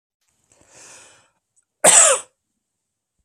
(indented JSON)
{
  "cough_length": "3.2 s",
  "cough_amplitude": 32768,
  "cough_signal_mean_std_ratio": 0.26,
  "survey_phase": "alpha (2021-03-01 to 2021-08-12)",
  "age": "45-64",
  "gender": "Male",
  "wearing_mask": "No",
  "symptom_none": true,
  "smoker_status": "Never smoked",
  "respiratory_condition_asthma": false,
  "respiratory_condition_other": false,
  "recruitment_source": "REACT",
  "submission_delay": "1 day",
  "covid_test_result": "Negative",
  "covid_test_method": "RT-qPCR"
}